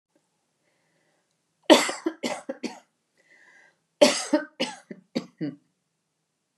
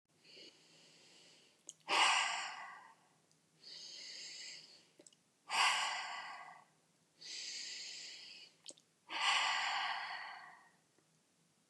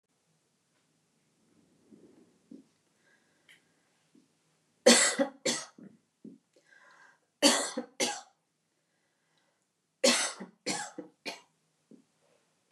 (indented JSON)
{
  "cough_length": "6.6 s",
  "cough_amplitude": 27426,
  "cough_signal_mean_std_ratio": 0.26,
  "exhalation_length": "11.7 s",
  "exhalation_amplitude": 3405,
  "exhalation_signal_mean_std_ratio": 0.46,
  "three_cough_length": "12.7 s",
  "three_cough_amplitude": 16899,
  "three_cough_signal_mean_std_ratio": 0.25,
  "survey_phase": "beta (2021-08-13 to 2022-03-07)",
  "age": "45-64",
  "gender": "Female",
  "wearing_mask": "No",
  "symptom_none": true,
  "smoker_status": "Never smoked",
  "respiratory_condition_asthma": false,
  "respiratory_condition_other": false,
  "recruitment_source": "REACT",
  "submission_delay": "1 day",
  "covid_test_result": "Negative",
  "covid_test_method": "RT-qPCR",
  "influenza_a_test_result": "Negative",
  "influenza_b_test_result": "Negative"
}